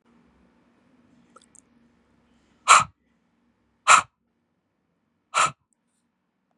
{
  "exhalation_length": "6.6 s",
  "exhalation_amplitude": 32415,
  "exhalation_signal_mean_std_ratio": 0.19,
  "survey_phase": "beta (2021-08-13 to 2022-03-07)",
  "age": "18-44",
  "gender": "Male",
  "wearing_mask": "No",
  "symptom_cough_any": true,
  "symptom_new_continuous_cough": true,
  "symptom_runny_or_blocked_nose": true,
  "symptom_shortness_of_breath": true,
  "symptom_sore_throat": true,
  "symptom_fatigue": true,
  "symptom_headache": true,
  "smoker_status": "Never smoked",
  "respiratory_condition_asthma": false,
  "respiratory_condition_other": false,
  "recruitment_source": "Test and Trace",
  "submission_delay": "1 day",
  "covid_test_result": "Positive",
  "covid_test_method": "RT-qPCR",
  "covid_ct_value": 19.4,
  "covid_ct_gene": "N gene"
}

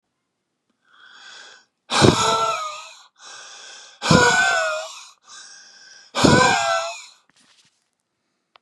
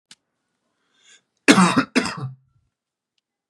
{
  "exhalation_length": "8.6 s",
  "exhalation_amplitude": 32768,
  "exhalation_signal_mean_std_ratio": 0.44,
  "cough_length": "3.5 s",
  "cough_amplitude": 32767,
  "cough_signal_mean_std_ratio": 0.29,
  "survey_phase": "beta (2021-08-13 to 2022-03-07)",
  "age": "18-44",
  "gender": "Male",
  "wearing_mask": "No",
  "symptom_none": true,
  "smoker_status": "Never smoked",
  "respiratory_condition_asthma": false,
  "respiratory_condition_other": false,
  "recruitment_source": "Test and Trace",
  "submission_delay": "2 days",
  "covid_test_result": "Positive",
  "covid_test_method": "RT-qPCR",
  "covid_ct_value": 24.0,
  "covid_ct_gene": "ORF1ab gene",
  "covid_ct_mean": 24.6,
  "covid_viral_load": "8700 copies/ml",
  "covid_viral_load_category": "Minimal viral load (< 10K copies/ml)"
}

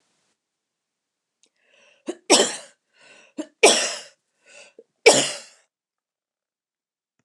{
  "three_cough_length": "7.2 s",
  "three_cough_amplitude": 29204,
  "three_cough_signal_mean_std_ratio": 0.25,
  "survey_phase": "alpha (2021-03-01 to 2021-08-12)",
  "age": "65+",
  "gender": "Female",
  "wearing_mask": "No",
  "symptom_none": true,
  "smoker_status": "Ex-smoker",
  "respiratory_condition_asthma": false,
  "respiratory_condition_other": false,
  "recruitment_source": "REACT",
  "submission_delay": "2 days",
  "covid_test_result": "Negative",
  "covid_test_method": "RT-qPCR"
}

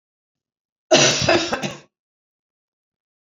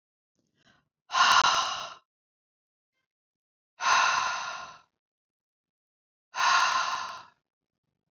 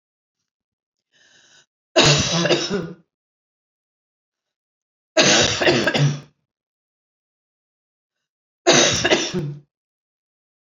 {
  "cough_length": "3.3 s",
  "cough_amplitude": 28166,
  "cough_signal_mean_std_ratio": 0.35,
  "exhalation_length": "8.1 s",
  "exhalation_amplitude": 12511,
  "exhalation_signal_mean_std_ratio": 0.41,
  "three_cough_length": "10.7 s",
  "three_cough_amplitude": 29518,
  "three_cough_signal_mean_std_ratio": 0.39,
  "survey_phase": "beta (2021-08-13 to 2022-03-07)",
  "age": "45-64",
  "gender": "Female",
  "wearing_mask": "No",
  "symptom_none": true,
  "smoker_status": "Never smoked",
  "respiratory_condition_asthma": false,
  "respiratory_condition_other": false,
  "recruitment_source": "REACT",
  "submission_delay": "1 day",
  "covid_test_result": "Negative",
  "covid_test_method": "RT-qPCR"
}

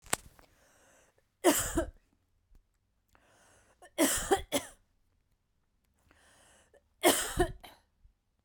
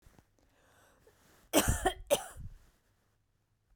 {
  "three_cough_length": "8.4 s",
  "three_cough_amplitude": 20947,
  "three_cough_signal_mean_std_ratio": 0.3,
  "cough_length": "3.8 s",
  "cough_amplitude": 8586,
  "cough_signal_mean_std_ratio": 0.3,
  "survey_phase": "beta (2021-08-13 to 2022-03-07)",
  "age": "18-44",
  "gender": "Female",
  "wearing_mask": "No",
  "symptom_none": true,
  "symptom_onset": "12 days",
  "smoker_status": "Never smoked",
  "respiratory_condition_asthma": false,
  "respiratory_condition_other": false,
  "recruitment_source": "REACT",
  "submission_delay": "2 days",
  "covid_test_result": "Negative",
  "covid_test_method": "RT-qPCR"
}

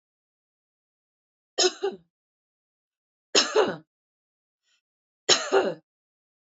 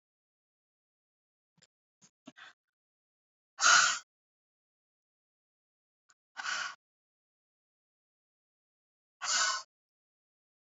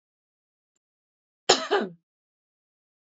{
  "three_cough_length": "6.5 s",
  "three_cough_amplitude": 20082,
  "three_cough_signal_mean_std_ratio": 0.28,
  "exhalation_length": "10.7 s",
  "exhalation_amplitude": 9318,
  "exhalation_signal_mean_std_ratio": 0.22,
  "cough_length": "3.2 s",
  "cough_amplitude": 29444,
  "cough_signal_mean_std_ratio": 0.22,
  "survey_phase": "beta (2021-08-13 to 2022-03-07)",
  "age": "45-64",
  "gender": "Female",
  "wearing_mask": "No",
  "symptom_none": true,
  "smoker_status": "Ex-smoker",
  "respiratory_condition_asthma": false,
  "respiratory_condition_other": false,
  "recruitment_source": "REACT",
  "submission_delay": "5 days",
  "covid_test_result": "Negative",
  "covid_test_method": "RT-qPCR",
  "influenza_a_test_result": "Negative",
  "influenza_b_test_result": "Negative"
}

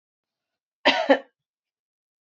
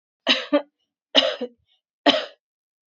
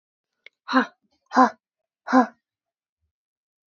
{
  "cough_length": "2.2 s",
  "cough_amplitude": 19921,
  "cough_signal_mean_std_ratio": 0.26,
  "three_cough_length": "3.0 s",
  "three_cough_amplitude": 26572,
  "three_cough_signal_mean_std_ratio": 0.34,
  "exhalation_length": "3.7 s",
  "exhalation_amplitude": 25828,
  "exhalation_signal_mean_std_ratio": 0.25,
  "survey_phase": "beta (2021-08-13 to 2022-03-07)",
  "age": "18-44",
  "gender": "Female",
  "wearing_mask": "No",
  "symptom_runny_or_blocked_nose": true,
  "symptom_sore_throat": true,
  "symptom_fatigue": true,
  "symptom_headache": true,
  "smoker_status": "Never smoked",
  "respiratory_condition_asthma": false,
  "respiratory_condition_other": false,
  "recruitment_source": "Test and Trace",
  "submission_delay": "2 days",
  "covid_test_result": "Positive",
  "covid_test_method": "RT-qPCR"
}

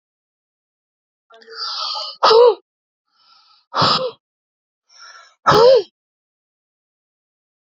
{
  "exhalation_length": "7.8 s",
  "exhalation_amplitude": 29067,
  "exhalation_signal_mean_std_ratio": 0.33,
  "survey_phase": "beta (2021-08-13 to 2022-03-07)",
  "age": "65+",
  "gender": "Male",
  "wearing_mask": "No",
  "symptom_none": true,
  "smoker_status": "Never smoked",
  "respiratory_condition_asthma": false,
  "respiratory_condition_other": false,
  "recruitment_source": "REACT",
  "submission_delay": "1 day",
  "covid_test_result": "Negative",
  "covid_test_method": "RT-qPCR",
  "influenza_a_test_result": "Negative",
  "influenza_b_test_result": "Negative"
}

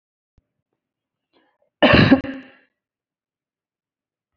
{
  "cough_length": "4.4 s",
  "cough_amplitude": 27901,
  "cough_signal_mean_std_ratio": 0.24,
  "survey_phase": "beta (2021-08-13 to 2022-03-07)",
  "age": "45-64",
  "gender": "Female",
  "wearing_mask": "No",
  "symptom_none": true,
  "smoker_status": "Never smoked",
  "respiratory_condition_asthma": false,
  "respiratory_condition_other": false,
  "recruitment_source": "REACT",
  "submission_delay": "1 day",
  "covid_test_result": "Negative",
  "covid_test_method": "RT-qPCR",
  "influenza_a_test_result": "Negative",
  "influenza_b_test_result": "Negative"
}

